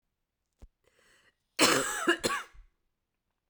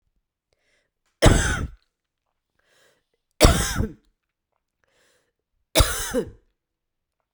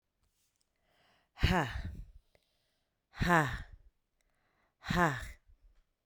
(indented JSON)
{
  "cough_length": "3.5 s",
  "cough_amplitude": 11026,
  "cough_signal_mean_std_ratio": 0.34,
  "three_cough_length": "7.3 s",
  "three_cough_amplitude": 32768,
  "three_cough_signal_mean_std_ratio": 0.29,
  "exhalation_length": "6.1 s",
  "exhalation_amplitude": 7812,
  "exhalation_signal_mean_std_ratio": 0.34,
  "survey_phase": "beta (2021-08-13 to 2022-03-07)",
  "age": "18-44",
  "gender": "Female",
  "wearing_mask": "No",
  "symptom_cough_any": true,
  "symptom_change_to_sense_of_smell_or_taste": true,
  "symptom_onset": "7 days",
  "smoker_status": "Current smoker (e-cigarettes or vapes only)",
  "respiratory_condition_asthma": false,
  "respiratory_condition_other": false,
  "recruitment_source": "Test and Trace",
  "submission_delay": "1 day",
  "covid_test_result": "Positive",
  "covid_test_method": "RT-qPCR"
}